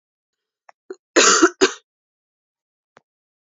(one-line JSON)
{"cough_length": "3.6 s", "cough_amplitude": 29942, "cough_signal_mean_std_ratio": 0.27, "survey_phase": "beta (2021-08-13 to 2022-03-07)", "age": "18-44", "gender": "Female", "wearing_mask": "No", "symptom_none": true, "symptom_onset": "5 days", "smoker_status": "Never smoked", "respiratory_condition_asthma": false, "respiratory_condition_other": false, "recruitment_source": "Test and Trace", "submission_delay": "3 days", "covid_test_result": "Positive", "covid_test_method": "RT-qPCR", "covid_ct_value": 30.4, "covid_ct_gene": "N gene"}